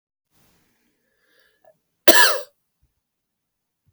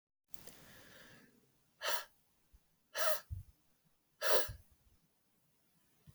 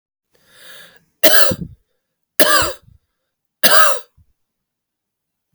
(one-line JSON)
{"cough_length": "3.9 s", "cough_amplitude": 32768, "cough_signal_mean_std_ratio": 0.2, "exhalation_length": "6.1 s", "exhalation_amplitude": 5767, "exhalation_signal_mean_std_ratio": 0.3, "three_cough_length": "5.5 s", "three_cough_amplitude": 32768, "three_cough_signal_mean_std_ratio": 0.34, "survey_phase": "beta (2021-08-13 to 2022-03-07)", "age": "45-64", "gender": "Female", "wearing_mask": "No", "symptom_none": true, "symptom_onset": "6 days", "smoker_status": "Ex-smoker", "respiratory_condition_asthma": true, "respiratory_condition_other": false, "recruitment_source": "REACT", "submission_delay": "1 day", "covid_test_result": "Negative", "covid_test_method": "RT-qPCR", "influenza_a_test_result": "Negative", "influenza_b_test_result": "Negative"}